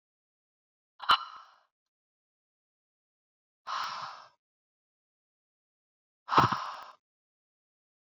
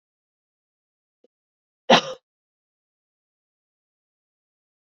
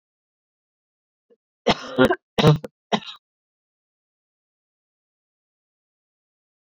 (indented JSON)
{
  "exhalation_length": "8.2 s",
  "exhalation_amplitude": 11663,
  "exhalation_signal_mean_std_ratio": 0.22,
  "cough_length": "4.9 s",
  "cough_amplitude": 26856,
  "cough_signal_mean_std_ratio": 0.13,
  "three_cough_length": "6.7 s",
  "three_cough_amplitude": 27834,
  "three_cough_signal_mean_std_ratio": 0.22,
  "survey_phase": "beta (2021-08-13 to 2022-03-07)",
  "age": "18-44",
  "gender": "Female",
  "wearing_mask": "No",
  "symptom_cough_any": true,
  "symptom_runny_or_blocked_nose": true,
  "symptom_shortness_of_breath": true,
  "symptom_sore_throat": true,
  "symptom_fatigue": true,
  "symptom_headache": true,
  "symptom_other": true,
  "smoker_status": "Never smoked",
  "respiratory_condition_asthma": false,
  "respiratory_condition_other": false,
  "recruitment_source": "Test and Trace",
  "submission_delay": "1 day",
  "covid_test_result": "Positive",
  "covid_test_method": "RT-qPCR",
  "covid_ct_value": 25.0,
  "covid_ct_gene": "ORF1ab gene",
  "covid_ct_mean": 25.8,
  "covid_viral_load": "3500 copies/ml",
  "covid_viral_load_category": "Minimal viral load (< 10K copies/ml)"
}